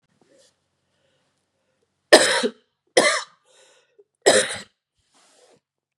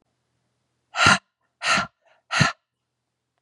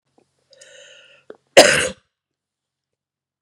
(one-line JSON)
{"three_cough_length": "6.0 s", "three_cough_amplitude": 32768, "three_cough_signal_mean_std_ratio": 0.27, "exhalation_length": "3.4 s", "exhalation_amplitude": 27694, "exhalation_signal_mean_std_ratio": 0.32, "cough_length": "3.4 s", "cough_amplitude": 32768, "cough_signal_mean_std_ratio": 0.21, "survey_phase": "beta (2021-08-13 to 2022-03-07)", "age": "45-64", "gender": "Female", "wearing_mask": "No", "symptom_cough_any": true, "symptom_runny_or_blocked_nose": true, "symptom_fatigue": true, "symptom_onset": "2 days", "smoker_status": "Never smoked", "respiratory_condition_asthma": false, "respiratory_condition_other": false, "recruitment_source": "Test and Trace", "submission_delay": "2 days", "covid_test_result": "Positive", "covid_test_method": "RT-qPCR", "covid_ct_value": 34.3, "covid_ct_gene": "N gene"}